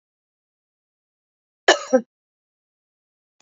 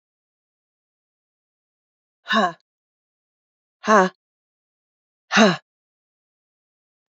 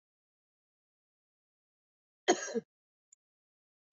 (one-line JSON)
{"cough_length": "3.4 s", "cough_amplitude": 28329, "cough_signal_mean_std_ratio": 0.17, "exhalation_length": "7.1 s", "exhalation_amplitude": 28560, "exhalation_signal_mean_std_ratio": 0.22, "three_cough_length": "3.9 s", "three_cough_amplitude": 8517, "three_cough_signal_mean_std_ratio": 0.16, "survey_phase": "beta (2021-08-13 to 2022-03-07)", "age": "65+", "gender": "Female", "wearing_mask": "No", "symptom_runny_or_blocked_nose": true, "symptom_fatigue": true, "symptom_headache": true, "symptom_other": true, "smoker_status": "Ex-smoker", "respiratory_condition_asthma": false, "respiratory_condition_other": false, "recruitment_source": "Test and Trace", "submission_delay": "1 day", "covid_test_result": "Positive", "covid_test_method": "LFT"}